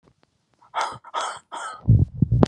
{"exhalation_length": "2.5 s", "exhalation_amplitude": 32768, "exhalation_signal_mean_std_ratio": 0.43, "survey_phase": "alpha (2021-03-01 to 2021-08-12)", "age": "65+", "gender": "Male", "wearing_mask": "No", "symptom_none": true, "smoker_status": "Never smoked", "respiratory_condition_asthma": false, "respiratory_condition_other": false, "recruitment_source": "REACT", "submission_delay": "2 days", "covid_test_result": "Negative", "covid_test_method": "RT-qPCR"}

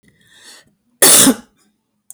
{"cough_length": "2.1 s", "cough_amplitude": 32768, "cough_signal_mean_std_ratio": 0.34, "survey_phase": "beta (2021-08-13 to 2022-03-07)", "age": "65+", "gender": "Female", "wearing_mask": "No", "symptom_none": true, "smoker_status": "Never smoked", "respiratory_condition_asthma": false, "respiratory_condition_other": false, "recruitment_source": "REACT", "submission_delay": "1 day", "covid_test_result": "Negative", "covid_test_method": "RT-qPCR"}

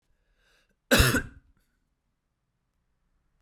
{"cough_length": "3.4 s", "cough_amplitude": 17573, "cough_signal_mean_std_ratio": 0.24, "survey_phase": "beta (2021-08-13 to 2022-03-07)", "age": "18-44", "gender": "Male", "wearing_mask": "No", "symptom_runny_or_blocked_nose": true, "symptom_sore_throat": true, "symptom_change_to_sense_of_smell_or_taste": true, "symptom_loss_of_taste": true, "symptom_onset": "6 days", "smoker_status": "Never smoked", "respiratory_condition_asthma": false, "respiratory_condition_other": false, "recruitment_source": "Test and Trace", "submission_delay": "2 days", "covid_test_result": "Positive", "covid_test_method": "RT-qPCR", "covid_ct_value": 17.7, "covid_ct_gene": "ORF1ab gene"}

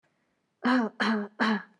{"three_cough_length": "1.8 s", "three_cough_amplitude": 9205, "three_cough_signal_mean_std_ratio": 0.56, "survey_phase": "beta (2021-08-13 to 2022-03-07)", "age": "18-44", "gender": "Female", "wearing_mask": "Yes", "symptom_none": true, "symptom_onset": "4 days", "smoker_status": "Never smoked", "respiratory_condition_asthma": false, "respiratory_condition_other": false, "recruitment_source": "REACT", "submission_delay": "1 day", "covid_test_result": "Negative", "covid_test_method": "RT-qPCR", "influenza_a_test_result": "Unknown/Void", "influenza_b_test_result": "Unknown/Void"}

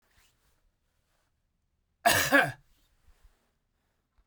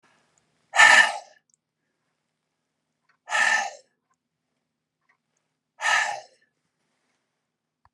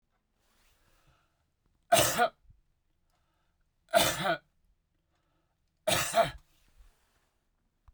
{"cough_length": "4.3 s", "cough_amplitude": 13601, "cough_signal_mean_std_ratio": 0.25, "exhalation_length": "7.9 s", "exhalation_amplitude": 29289, "exhalation_signal_mean_std_ratio": 0.26, "three_cough_length": "7.9 s", "three_cough_amplitude": 10504, "three_cough_signal_mean_std_ratio": 0.3, "survey_phase": "beta (2021-08-13 to 2022-03-07)", "age": "65+", "gender": "Male", "wearing_mask": "No", "symptom_none": true, "smoker_status": "Ex-smoker", "respiratory_condition_asthma": false, "respiratory_condition_other": false, "recruitment_source": "REACT", "submission_delay": "2 days", "covid_test_result": "Negative", "covid_test_method": "RT-qPCR"}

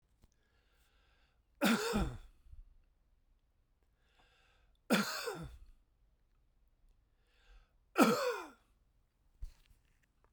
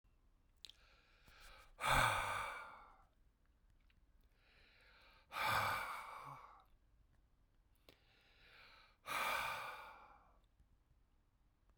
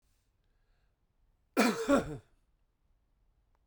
{"three_cough_length": "10.3 s", "three_cough_amplitude": 9679, "three_cough_signal_mean_std_ratio": 0.3, "exhalation_length": "11.8 s", "exhalation_amplitude": 2607, "exhalation_signal_mean_std_ratio": 0.39, "cough_length": "3.7 s", "cough_amplitude": 7933, "cough_signal_mean_std_ratio": 0.29, "survey_phase": "beta (2021-08-13 to 2022-03-07)", "age": "45-64", "gender": "Male", "wearing_mask": "No", "symptom_runny_or_blocked_nose": true, "symptom_headache": true, "symptom_change_to_sense_of_smell_or_taste": true, "symptom_loss_of_taste": true, "smoker_status": "Never smoked", "respiratory_condition_asthma": false, "respiratory_condition_other": false, "recruitment_source": "Test and Trace", "submission_delay": "2 days", "covid_test_result": "Positive", "covid_test_method": "RT-qPCR", "covid_ct_value": 20.2, "covid_ct_gene": "ORF1ab gene"}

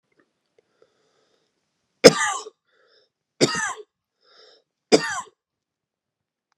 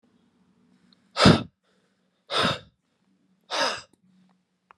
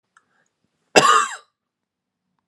{"three_cough_length": "6.6 s", "three_cough_amplitude": 32768, "three_cough_signal_mean_std_ratio": 0.2, "exhalation_length": "4.8 s", "exhalation_amplitude": 25523, "exhalation_signal_mean_std_ratio": 0.27, "cough_length": "2.5 s", "cough_amplitude": 32767, "cough_signal_mean_std_ratio": 0.28, "survey_phase": "alpha (2021-03-01 to 2021-08-12)", "age": "18-44", "gender": "Male", "wearing_mask": "Yes", "symptom_none": true, "smoker_status": "Never smoked", "respiratory_condition_asthma": false, "respiratory_condition_other": false, "recruitment_source": "REACT", "submission_delay": "1 day", "covid_test_result": "Negative", "covid_test_method": "RT-qPCR"}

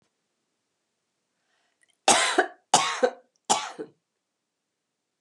{"three_cough_length": "5.2 s", "three_cough_amplitude": 21388, "three_cough_signal_mean_std_ratio": 0.3, "survey_phase": "beta (2021-08-13 to 2022-03-07)", "age": "45-64", "gender": "Female", "wearing_mask": "No", "symptom_runny_or_blocked_nose": true, "smoker_status": "Never smoked", "respiratory_condition_asthma": true, "respiratory_condition_other": false, "recruitment_source": "REACT", "submission_delay": "1 day", "covid_test_result": "Negative", "covid_test_method": "RT-qPCR", "influenza_a_test_result": "Negative", "influenza_b_test_result": "Negative"}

